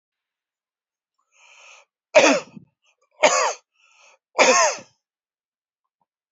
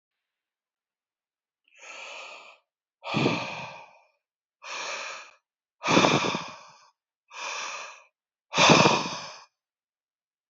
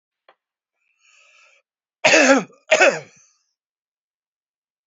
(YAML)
three_cough_length: 6.3 s
three_cough_amplitude: 28080
three_cough_signal_mean_std_ratio: 0.3
exhalation_length: 10.5 s
exhalation_amplitude: 26121
exhalation_signal_mean_std_ratio: 0.35
cough_length: 4.9 s
cough_amplitude: 28550
cough_signal_mean_std_ratio: 0.28
survey_phase: beta (2021-08-13 to 2022-03-07)
age: 65+
gender: Male
wearing_mask: 'No'
symptom_cough_any: true
symptom_runny_or_blocked_nose: true
smoker_status: Ex-smoker
respiratory_condition_asthma: false
respiratory_condition_other: false
recruitment_source: REACT
submission_delay: 2 days
covid_test_result: Negative
covid_test_method: RT-qPCR